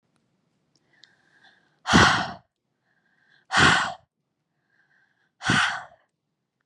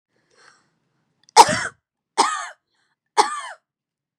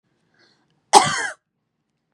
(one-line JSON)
{"exhalation_length": "6.7 s", "exhalation_amplitude": 22320, "exhalation_signal_mean_std_ratio": 0.32, "three_cough_length": "4.2 s", "three_cough_amplitude": 32768, "three_cough_signal_mean_std_ratio": 0.26, "cough_length": "2.1 s", "cough_amplitude": 32768, "cough_signal_mean_std_ratio": 0.25, "survey_phase": "beta (2021-08-13 to 2022-03-07)", "age": "18-44", "gender": "Female", "wearing_mask": "No", "symptom_none": true, "smoker_status": "Current smoker (e-cigarettes or vapes only)", "respiratory_condition_asthma": false, "respiratory_condition_other": false, "recruitment_source": "REACT", "submission_delay": "5 days", "covid_test_result": "Negative", "covid_test_method": "RT-qPCR", "influenza_a_test_result": "Negative", "influenza_b_test_result": "Negative"}